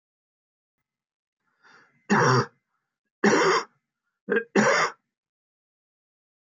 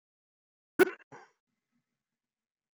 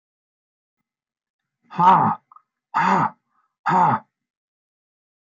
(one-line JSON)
{"three_cough_length": "6.5 s", "three_cough_amplitude": 15611, "three_cough_signal_mean_std_ratio": 0.36, "cough_length": "2.7 s", "cough_amplitude": 8004, "cough_signal_mean_std_ratio": 0.14, "exhalation_length": "5.2 s", "exhalation_amplitude": 21197, "exhalation_signal_mean_std_ratio": 0.37, "survey_phase": "beta (2021-08-13 to 2022-03-07)", "age": "65+", "gender": "Male", "wearing_mask": "No", "symptom_none": true, "smoker_status": "Never smoked", "respiratory_condition_asthma": false, "respiratory_condition_other": false, "recruitment_source": "REACT", "submission_delay": "4 days", "covid_test_result": "Negative", "covid_test_method": "RT-qPCR"}